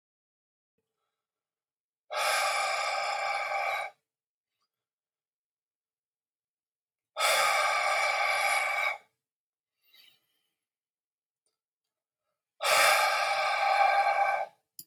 {"exhalation_length": "14.9 s", "exhalation_amplitude": 9934, "exhalation_signal_mean_std_ratio": 0.52, "survey_phase": "beta (2021-08-13 to 2022-03-07)", "age": "45-64", "gender": "Male", "wearing_mask": "No", "symptom_none": true, "smoker_status": "Never smoked", "respiratory_condition_asthma": false, "respiratory_condition_other": false, "recruitment_source": "REACT", "submission_delay": "3 days", "covid_test_result": "Negative", "covid_test_method": "RT-qPCR", "influenza_a_test_result": "Negative", "influenza_b_test_result": "Negative"}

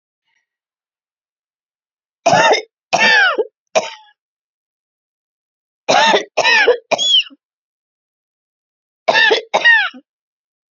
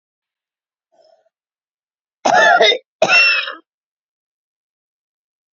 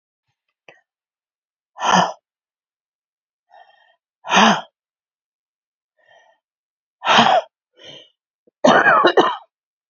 {"three_cough_length": "10.8 s", "three_cough_amplitude": 31356, "three_cough_signal_mean_std_ratio": 0.41, "cough_length": "5.5 s", "cough_amplitude": 28625, "cough_signal_mean_std_ratio": 0.34, "exhalation_length": "9.9 s", "exhalation_amplitude": 30155, "exhalation_signal_mean_std_ratio": 0.32, "survey_phase": "beta (2021-08-13 to 2022-03-07)", "age": "45-64", "gender": "Female", "wearing_mask": "No", "symptom_cough_any": true, "symptom_fatigue": true, "symptom_headache": true, "symptom_change_to_sense_of_smell_or_taste": true, "symptom_onset": "2 days", "smoker_status": "Current smoker (1 to 10 cigarettes per day)", "respiratory_condition_asthma": false, "respiratory_condition_other": false, "recruitment_source": "Test and Trace", "submission_delay": "2 days", "covid_test_result": "Positive", "covid_test_method": "RT-qPCR", "covid_ct_value": 26.9, "covid_ct_gene": "ORF1ab gene"}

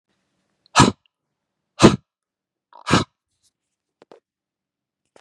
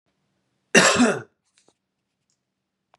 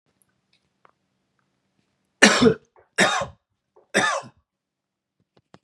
{"exhalation_length": "5.2 s", "exhalation_amplitude": 32768, "exhalation_signal_mean_std_ratio": 0.2, "cough_length": "3.0 s", "cough_amplitude": 32756, "cough_signal_mean_std_ratio": 0.29, "three_cough_length": "5.6 s", "three_cough_amplitude": 32768, "three_cough_signal_mean_std_ratio": 0.28, "survey_phase": "beta (2021-08-13 to 2022-03-07)", "age": "45-64", "gender": "Male", "wearing_mask": "No", "symptom_cough_any": true, "symptom_sore_throat": true, "symptom_diarrhoea": true, "symptom_headache": true, "symptom_onset": "5 days", "smoker_status": "Never smoked", "respiratory_condition_asthma": false, "respiratory_condition_other": false, "recruitment_source": "Test and Trace", "submission_delay": "2 days", "covid_test_result": "Positive", "covid_test_method": "RT-qPCR", "covid_ct_value": 20.8, "covid_ct_gene": "N gene"}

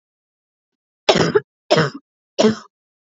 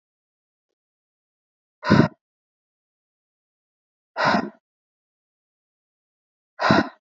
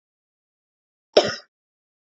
{"three_cough_length": "3.1 s", "three_cough_amplitude": 29298, "three_cough_signal_mean_std_ratio": 0.35, "exhalation_length": "7.1 s", "exhalation_amplitude": 26489, "exhalation_signal_mean_std_ratio": 0.24, "cough_length": "2.1 s", "cough_amplitude": 27652, "cough_signal_mean_std_ratio": 0.18, "survey_phase": "beta (2021-08-13 to 2022-03-07)", "age": "18-44", "gender": "Female", "wearing_mask": "No", "symptom_cough_any": true, "symptom_sore_throat": true, "symptom_headache": true, "smoker_status": "Never smoked", "respiratory_condition_asthma": false, "respiratory_condition_other": false, "recruitment_source": "Test and Trace", "submission_delay": "2 days", "covid_test_result": "Positive", "covid_test_method": "LFT"}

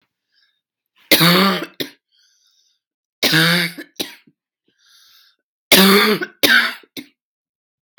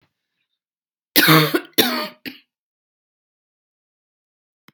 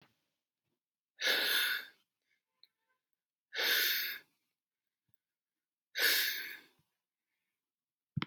{"three_cough_length": "8.0 s", "three_cough_amplitude": 32768, "three_cough_signal_mean_std_ratio": 0.39, "cough_length": "4.7 s", "cough_amplitude": 32768, "cough_signal_mean_std_ratio": 0.29, "exhalation_length": "8.3 s", "exhalation_amplitude": 4745, "exhalation_signal_mean_std_ratio": 0.38, "survey_phase": "beta (2021-08-13 to 2022-03-07)", "age": "45-64", "gender": "Female", "wearing_mask": "No", "symptom_cough_any": true, "symptom_new_continuous_cough": true, "symptom_headache": true, "symptom_change_to_sense_of_smell_or_taste": true, "symptom_onset": "7 days", "smoker_status": "Never smoked", "respiratory_condition_asthma": false, "respiratory_condition_other": false, "recruitment_source": "Test and Trace", "submission_delay": "4 days", "covid_test_method": "RT-qPCR"}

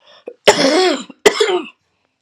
{"cough_length": "2.2 s", "cough_amplitude": 32768, "cough_signal_mean_std_ratio": 0.5, "survey_phase": "alpha (2021-03-01 to 2021-08-12)", "age": "45-64", "gender": "Female", "wearing_mask": "No", "symptom_cough_any": true, "symptom_shortness_of_breath": true, "symptom_fatigue": true, "symptom_headache": true, "symptom_onset": "4 days", "smoker_status": "Prefer not to say", "respiratory_condition_asthma": false, "respiratory_condition_other": false, "recruitment_source": "Test and Trace", "submission_delay": "2 days", "covid_test_result": "Positive", "covid_test_method": "RT-qPCR", "covid_ct_value": 15.5, "covid_ct_gene": "ORF1ab gene", "covid_ct_mean": 15.5, "covid_viral_load": "8200000 copies/ml", "covid_viral_load_category": "High viral load (>1M copies/ml)"}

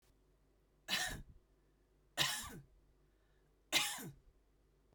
{"three_cough_length": "4.9 s", "three_cough_amplitude": 3873, "three_cough_signal_mean_std_ratio": 0.36, "survey_phase": "beta (2021-08-13 to 2022-03-07)", "age": "45-64", "gender": "Female", "wearing_mask": "No", "symptom_none": true, "smoker_status": "Never smoked", "respiratory_condition_asthma": false, "respiratory_condition_other": false, "recruitment_source": "REACT", "submission_delay": "3 days", "covid_test_result": "Negative", "covid_test_method": "RT-qPCR", "influenza_a_test_result": "Negative", "influenza_b_test_result": "Negative"}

